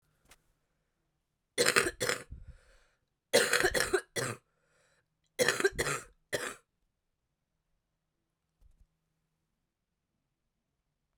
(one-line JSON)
{"three_cough_length": "11.2 s", "three_cough_amplitude": 15545, "three_cough_signal_mean_std_ratio": 0.3, "survey_phase": "beta (2021-08-13 to 2022-03-07)", "age": "18-44", "gender": "Female", "wearing_mask": "No", "symptom_cough_any": true, "symptom_runny_or_blocked_nose": true, "symptom_shortness_of_breath": true, "symptom_abdominal_pain": true, "symptom_fatigue": true, "symptom_headache": true, "symptom_change_to_sense_of_smell_or_taste": true, "symptom_loss_of_taste": true, "symptom_onset": "4 days", "smoker_status": "Current smoker (1 to 10 cigarettes per day)", "respiratory_condition_asthma": false, "respiratory_condition_other": false, "recruitment_source": "Test and Trace", "submission_delay": "2 days", "covid_test_result": "Positive", "covid_test_method": "RT-qPCR", "covid_ct_value": 16.2, "covid_ct_gene": "ORF1ab gene", "covid_ct_mean": 16.4, "covid_viral_load": "4000000 copies/ml", "covid_viral_load_category": "High viral load (>1M copies/ml)"}